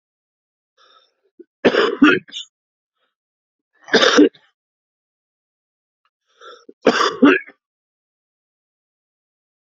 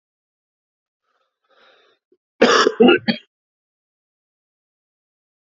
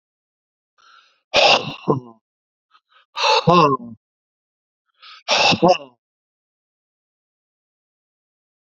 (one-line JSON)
{"three_cough_length": "9.6 s", "three_cough_amplitude": 32767, "three_cough_signal_mean_std_ratio": 0.28, "cough_length": "5.5 s", "cough_amplitude": 28073, "cough_signal_mean_std_ratio": 0.25, "exhalation_length": "8.6 s", "exhalation_amplitude": 32768, "exhalation_signal_mean_std_ratio": 0.32, "survey_phase": "beta (2021-08-13 to 2022-03-07)", "age": "45-64", "gender": "Male", "wearing_mask": "No", "symptom_cough_any": true, "symptom_new_continuous_cough": true, "symptom_runny_or_blocked_nose": true, "symptom_fatigue": true, "symptom_onset": "2 days", "smoker_status": "Never smoked", "respiratory_condition_asthma": true, "respiratory_condition_other": false, "recruitment_source": "Test and Trace", "submission_delay": "0 days", "covid_test_result": "Positive", "covid_test_method": "ePCR"}